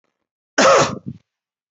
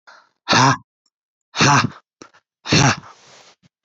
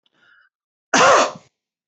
{"cough_length": "1.7 s", "cough_amplitude": 26372, "cough_signal_mean_std_ratio": 0.39, "exhalation_length": "3.8 s", "exhalation_amplitude": 29638, "exhalation_signal_mean_std_ratio": 0.4, "three_cough_length": "1.9 s", "three_cough_amplitude": 24598, "three_cough_signal_mean_std_ratio": 0.37, "survey_phase": "beta (2021-08-13 to 2022-03-07)", "age": "45-64", "gender": "Male", "wearing_mask": "No", "symptom_none": true, "smoker_status": "Never smoked", "respiratory_condition_asthma": false, "respiratory_condition_other": false, "recruitment_source": "REACT", "submission_delay": "3 days", "covid_test_result": "Negative", "covid_test_method": "RT-qPCR", "influenza_a_test_result": "Negative", "influenza_b_test_result": "Negative"}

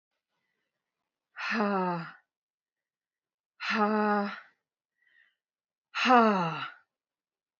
{"exhalation_length": "7.6 s", "exhalation_amplitude": 14359, "exhalation_signal_mean_std_ratio": 0.38, "survey_phase": "beta (2021-08-13 to 2022-03-07)", "age": "18-44", "gender": "Female", "wearing_mask": "No", "symptom_cough_any": true, "symptom_runny_or_blocked_nose": true, "symptom_shortness_of_breath": true, "symptom_fatigue": true, "symptom_headache": true, "symptom_other": true, "smoker_status": "Never smoked", "respiratory_condition_asthma": false, "respiratory_condition_other": false, "recruitment_source": "Test and Trace", "submission_delay": "3 days", "covid_test_result": "Positive", "covid_test_method": "RT-qPCR", "covid_ct_value": 22.7, "covid_ct_gene": "N gene", "covid_ct_mean": 22.9, "covid_viral_load": "32000 copies/ml", "covid_viral_load_category": "Low viral load (10K-1M copies/ml)"}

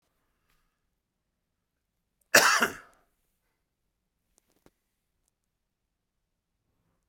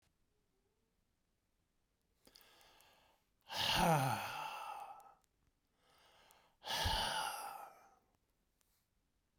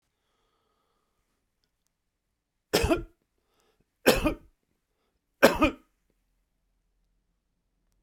{"cough_length": "7.1 s", "cough_amplitude": 22797, "cough_signal_mean_std_ratio": 0.16, "exhalation_length": "9.4 s", "exhalation_amplitude": 2787, "exhalation_signal_mean_std_ratio": 0.38, "three_cough_length": "8.0 s", "three_cough_amplitude": 29094, "three_cough_signal_mean_std_ratio": 0.22, "survey_phase": "beta (2021-08-13 to 2022-03-07)", "age": "65+", "gender": "Male", "wearing_mask": "No", "symptom_none": true, "smoker_status": "Ex-smoker", "respiratory_condition_asthma": false, "respiratory_condition_other": false, "recruitment_source": "REACT", "submission_delay": "1 day", "covid_test_result": "Negative", "covid_test_method": "RT-qPCR"}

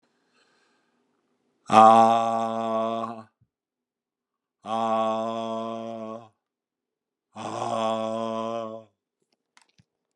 {"exhalation_length": "10.2 s", "exhalation_amplitude": 30125, "exhalation_signal_mean_std_ratio": 0.4, "survey_phase": "beta (2021-08-13 to 2022-03-07)", "age": "65+", "gender": "Male", "wearing_mask": "No", "symptom_cough_any": true, "symptom_runny_or_blocked_nose": true, "symptom_shortness_of_breath": true, "symptom_fatigue": true, "symptom_change_to_sense_of_smell_or_taste": true, "smoker_status": "Ex-smoker", "respiratory_condition_asthma": false, "respiratory_condition_other": false, "recruitment_source": "REACT", "submission_delay": "5 days", "covid_test_result": "Negative", "covid_test_method": "RT-qPCR"}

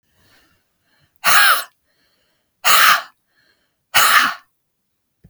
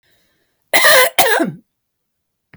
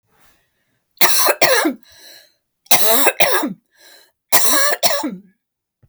{"exhalation_length": "5.3 s", "exhalation_amplitude": 32768, "exhalation_signal_mean_std_ratio": 0.38, "cough_length": "2.6 s", "cough_amplitude": 32768, "cough_signal_mean_std_ratio": 0.43, "three_cough_length": "5.9 s", "three_cough_amplitude": 32768, "three_cough_signal_mean_std_ratio": 0.5, "survey_phase": "beta (2021-08-13 to 2022-03-07)", "age": "65+", "gender": "Female", "wearing_mask": "No", "symptom_none": true, "smoker_status": "Never smoked", "respiratory_condition_asthma": true, "respiratory_condition_other": false, "recruitment_source": "REACT", "submission_delay": "1 day", "covid_test_result": "Negative", "covid_test_method": "RT-qPCR", "influenza_a_test_result": "Negative", "influenza_b_test_result": "Negative"}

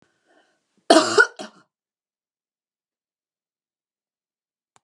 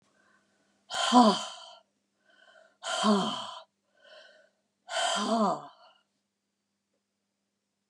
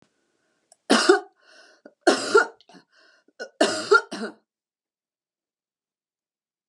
{"cough_length": "4.8 s", "cough_amplitude": 32673, "cough_signal_mean_std_ratio": 0.19, "exhalation_length": "7.9 s", "exhalation_amplitude": 15783, "exhalation_signal_mean_std_ratio": 0.36, "three_cough_length": "6.7 s", "three_cough_amplitude": 23886, "three_cough_signal_mean_std_ratio": 0.29, "survey_phase": "beta (2021-08-13 to 2022-03-07)", "age": "65+", "gender": "Female", "wearing_mask": "No", "symptom_none": true, "symptom_onset": "12 days", "smoker_status": "Ex-smoker", "respiratory_condition_asthma": false, "respiratory_condition_other": false, "recruitment_source": "REACT", "submission_delay": "1 day", "covid_test_result": "Negative", "covid_test_method": "RT-qPCR", "influenza_a_test_result": "Negative", "influenza_b_test_result": "Negative"}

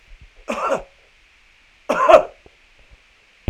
{"cough_length": "3.5 s", "cough_amplitude": 32768, "cough_signal_mean_std_ratio": 0.3, "survey_phase": "alpha (2021-03-01 to 2021-08-12)", "age": "65+", "gender": "Male", "wearing_mask": "No", "symptom_none": true, "smoker_status": "Never smoked", "respiratory_condition_asthma": false, "respiratory_condition_other": false, "recruitment_source": "REACT", "submission_delay": "1 day", "covid_test_result": "Negative", "covid_test_method": "RT-qPCR"}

